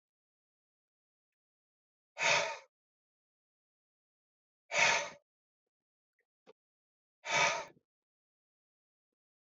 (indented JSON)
{
  "exhalation_length": "9.6 s",
  "exhalation_amplitude": 6569,
  "exhalation_signal_mean_std_ratio": 0.26,
  "survey_phase": "beta (2021-08-13 to 2022-03-07)",
  "age": "45-64",
  "gender": "Male",
  "wearing_mask": "No",
  "symptom_none": true,
  "smoker_status": "Ex-smoker",
  "respiratory_condition_asthma": false,
  "respiratory_condition_other": false,
  "recruitment_source": "REACT",
  "submission_delay": "2 days",
  "covid_test_result": "Negative",
  "covid_test_method": "RT-qPCR",
  "influenza_a_test_result": "Unknown/Void",
  "influenza_b_test_result": "Unknown/Void"
}